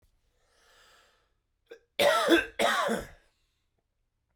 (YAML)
cough_length: 4.4 s
cough_amplitude: 11181
cough_signal_mean_std_ratio: 0.37
survey_phase: alpha (2021-03-01 to 2021-08-12)
age: 18-44
gender: Male
wearing_mask: 'No'
symptom_cough_any: true
symptom_headache: true
smoker_status: Never smoked
respiratory_condition_asthma: false
respiratory_condition_other: false
recruitment_source: Test and Trace
submission_delay: 2 days
covid_test_result: Positive
covid_test_method: RT-qPCR
covid_ct_value: 12.7
covid_ct_gene: N gene
covid_ct_mean: 13.5
covid_viral_load: 36000000 copies/ml
covid_viral_load_category: High viral load (>1M copies/ml)